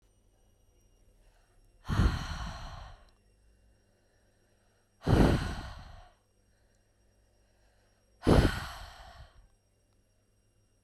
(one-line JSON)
{"exhalation_length": "10.8 s", "exhalation_amplitude": 10652, "exhalation_signal_mean_std_ratio": 0.3, "survey_phase": "beta (2021-08-13 to 2022-03-07)", "age": "18-44", "gender": "Female", "wearing_mask": "No", "symptom_fatigue": true, "smoker_status": "Ex-smoker", "respiratory_condition_asthma": false, "respiratory_condition_other": false, "recruitment_source": "REACT", "submission_delay": "0 days", "covid_test_result": "Negative", "covid_test_method": "RT-qPCR"}